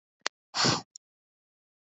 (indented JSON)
{
  "exhalation_length": "2.0 s",
  "exhalation_amplitude": 11860,
  "exhalation_signal_mean_std_ratio": 0.28,
  "survey_phase": "beta (2021-08-13 to 2022-03-07)",
  "age": "18-44",
  "gender": "Female",
  "wearing_mask": "No",
  "symptom_cough_any": true,
  "symptom_runny_or_blocked_nose": true,
  "symptom_shortness_of_breath": true,
  "symptom_sore_throat": true,
  "symptom_fatigue": true,
  "symptom_headache": true,
  "smoker_status": "Never smoked",
  "respiratory_condition_asthma": false,
  "respiratory_condition_other": false,
  "recruitment_source": "Test and Trace",
  "submission_delay": "2 days",
  "covid_test_result": "Positive",
  "covid_test_method": "RT-qPCR",
  "covid_ct_value": 27.6,
  "covid_ct_gene": "ORF1ab gene",
  "covid_ct_mean": 27.9,
  "covid_viral_load": "700 copies/ml",
  "covid_viral_load_category": "Minimal viral load (< 10K copies/ml)"
}